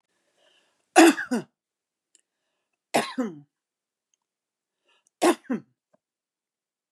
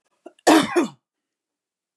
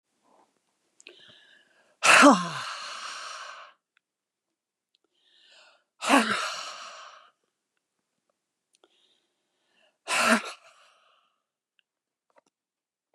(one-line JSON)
{"three_cough_length": "6.9 s", "three_cough_amplitude": 25767, "three_cough_signal_mean_std_ratio": 0.23, "cough_length": "2.0 s", "cough_amplitude": 28127, "cough_signal_mean_std_ratio": 0.33, "exhalation_length": "13.1 s", "exhalation_amplitude": 22056, "exhalation_signal_mean_std_ratio": 0.25, "survey_phase": "beta (2021-08-13 to 2022-03-07)", "age": "45-64", "gender": "Female", "wearing_mask": "No", "symptom_none": true, "symptom_onset": "4 days", "smoker_status": "Never smoked", "respiratory_condition_asthma": true, "respiratory_condition_other": false, "recruitment_source": "REACT", "submission_delay": "2 days", "covid_test_result": "Negative", "covid_test_method": "RT-qPCR", "influenza_a_test_result": "Negative", "influenza_b_test_result": "Negative"}